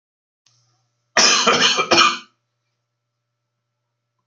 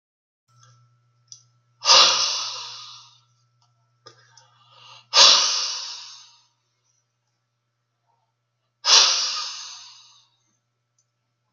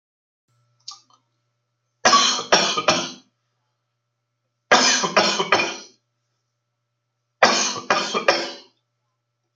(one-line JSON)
{"cough_length": "4.3 s", "cough_amplitude": 32427, "cough_signal_mean_std_ratio": 0.37, "exhalation_length": "11.5 s", "exhalation_amplitude": 32768, "exhalation_signal_mean_std_ratio": 0.31, "three_cough_length": "9.6 s", "three_cough_amplitude": 32768, "three_cough_signal_mean_std_ratio": 0.4, "survey_phase": "alpha (2021-03-01 to 2021-08-12)", "age": "45-64", "gender": "Male", "wearing_mask": "No", "symptom_cough_any": true, "symptom_headache": true, "smoker_status": "Ex-smoker", "respiratory_condition_asthma": false, "respiratory_condition_other": false, "recruitment_source": "REACT", "submission_delay": "1 day", "covid_test_result": "Negative", "covid_test_method": "RT-qPCR"}